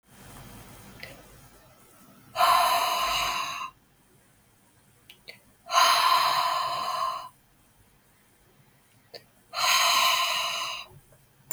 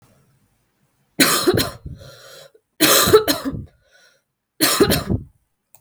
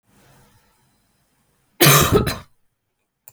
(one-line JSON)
{"exhalation_length": "11.5 s", "exhalation_amplitude": 15550, "exhalation_signal_mean_std_ratio": 0.52, "three_cough_length": "5.8 s", "three_cough_amplitude": 32767, "three_cough_signal_mean_std_ratio": 0.43, "cough_length": "3.3 s", "cough_amplitude": 32768, "cough_signal_mean_std_ratio": 0.31, "survey_phase": "beta (2021-08-13 to 2022-03-07)", "age": "18-44", "gender": "Female", "wearing_mask": "No", "symptom_cough_any": true, "symptom_runny_or_blocked_nose": true, "symptom_onset": "5 days", "smoker_status": "Never smoked", "respiratory_condition_asthma": false, "respiratory_condition_other": false, "recruitment_source": "Test and Trace", "submission_delay": "2 days", "covid_test_result": "Positive", "covid_test_method": "RT-qPCR", "covid_ct_value": 30.9, "covid_ct_gene": "N gene"}